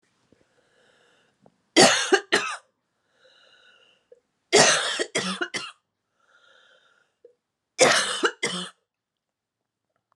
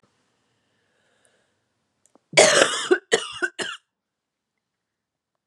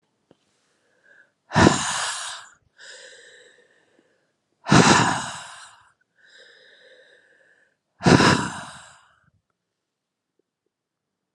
{"three_cough_length": "10.2 s", "three_cough_amplitude": 30920, "three_cough_signal_mean_std_ratio": 0.32, "cough_length": "5.5 s", "cough_amplitude": 32359, "cough_signal_mean_std_ratio": 0.28, "exhalation_length": "11.3 s", "exhalation_amplitude": 32675, "exhalation_signal_mean_std_ratio": 0.29, "survey_phase": "alpha (2021-03-01 to 2021-08-12)", "age": "45-64", "gender": "Female", "wearing_mask": "No", "symptom_cough_any": true, "symptom_fatigue": true, "symptom_headache": true, "smoker_status": "Never smoked", "respiratory_condition_asthma": true, "respiratory_condition_other": false, "recruitment_source": "Test and Trace", "submission_delay": "2 days", "covid_test_result": "Positive", "covid_test_method": "RT-qPCR", "covid_ct_value": 23.2, "covid_ct_gene": "ORF1ab gene", "covid_ct_mean": 23.5, "covid_viral_load": "20000 copies/ml", "covid_viral_load_category": "Low viral load (10K-1M copies/ml)"}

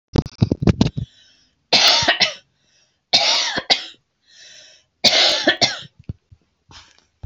{"three_cough_length": "7.3 s", "three_cough_amplitude": 32767, "three_cough_signal_mean_std_ratio": 0.43, "survey_phase": "beta (2021-08-13 to 2022-03-07)", "age": "65+", "gender": "Female", "wearing_mask": "No", "symptom_headache": true, "smoker_status": "Ex-smoker", "respiratory_condition_asthma": false, "respiratory_condition_other": false, "recruitment_source": "REACT", "submission_delay": "0 days", "covid_test_result": "Negative", "covid_test_method": "RT-qPCR"}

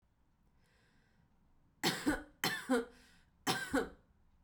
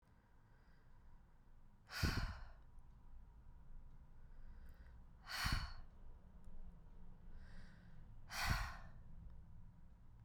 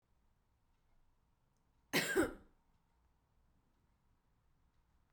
{"three_cough_length": "4.4 s", "three_cough_amplitude": 4480, "three_cough_signal_mean_std_ratio": 0.4, "exhalation_length": "10.2 s", "exhalation_amplitude": 1943, "exhalation_signal_mean_std_ratio": 0.62, "cough_length": "5.1 s", "cough_amplitude": 3529, "cough_signal_mean_std_ratio": 0.23, "survey_phase": "beta (2021-08-13 to 2022-03-07)", "age": "18-44", "gender": "Female", "wearing_mask": "No", "symptom_sore_throat": true, "symptom_fatigue": true, "symptom_headache": true, "smoker_status": "Never smoked", "respiratory_condition_asthma": false, "respiratory_condition_other": false, "recruitment_source": "Test and Trace", "submission_delay": "2 days", "covid_test_result": "Positive", "covid_test_method": "RT-qPCR", "covid_ct_value": 27.8, "covid_ct_gene": "S gene", "covid_ct_mean": 28.7, "covid_viral_load": "380 copies/ml", "covid_viral_load_category": "Minimal viral load (< 10K copies/ml)"}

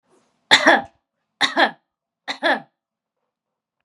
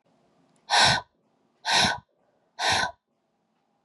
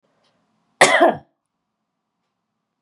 {"three_cough_length": "3.8 s", "three_cough_amplitude": 32766, "three_cough_signal_mean_std_ratio": 0.31, "exhalation_length": "3.8 s", "exhalation_amplitude": 16424, "exhalation_signal_mean_std_ratio": 0.39, "cough_length": "2.8 s", "cough_amplitude": 32767, "cough_signal_mean_std_ratio": 0.26, "survey_phase": "beta (2021-08-13 to 2022-03-07)", "age": "18-44", "gender": "Female", "wearing_mask": "No", "symptom_runny_or_blocked_nose": true, "symptom_fatigue": true, "symptom_other": true, "symptom_onset": "4 days", "smoker_status": "Never smoked", "respiratory_condition_asthma": false, "respiratory_condition_other": false, "recruitment_source": "Test and Trace", "submission_delay": "2 days", "covid_test_result": "Positive", "covid_test_method": "RT-qPCR", "covid_ct_value": 18.3, "covid_ct_gene": "ORF1ab gene", "covid_ct_mean": 18.4, "covid_viral_load": "940000 copies/ml", "covid_viral_load_category": "Low viral load (10K-1M copies/ml)"}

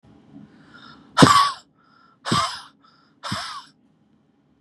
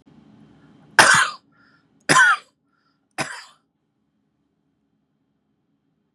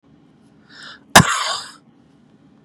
{"exhalation_length": "4.6 s", "exhalation_amplitude": 32768, "exhalation_signal_mean_std_ratio": 0.31, "three_cough_length": "6.1 s", "three_cough_amplitude": 32768, "three_cough_signal_mean_std_ratio": 0.26, "cough_length": "2.6 s", "cough_amplitude": 32768, "cough_signal_mean_std_ratio": 0.26, "survey_phase": "beta (2021-08-13 to 2022-03-07)", "age": "45-64", "gender": "Male", "wearing_mask": "No", "symptom_none": true, "smoker_status": "Current smoker (e-cigarettes or vapes only)", "respiratory_condition_asthma": false, "respiratory_condition_other": false, "recruitment_source": "REACT", "submission_delay": "2 days", "covid_test_method": "RT-qPCR", "influenza_a_test_result": "Unknown/Void", "influenza_b_test_result": "Unknown/Void"}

